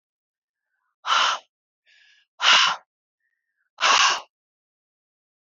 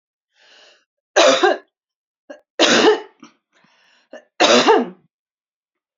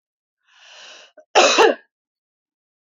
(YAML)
exhalation_length: 5.5 s
exhalation_amplitude: 24747
exhalation_signal_mean_std_ratio: 0.34
three_cough_length: 6.0 s
three_cough_amplitude: 32767
three_cough_signal_mean_std_ratio: 0.38
cough_length: 2.8 s
cough_amplitude: 29166
cough_signal_mean_std_ratio: 0.3
survey_phase: beta (2021-08-13 to 2022-03-07)
age: 45-64
gender: Female
wearing_mask: 'No'
symptom_none: true
symptom_onset: 4 days
smoker_status: Ex-smoker
respiratory_condition_asthma: true
respiratory_condition_other: false
recruitment_source: REACT
submission_delay: 1 day
covid_test_result: Negative
covid_test_method: RT-qPCR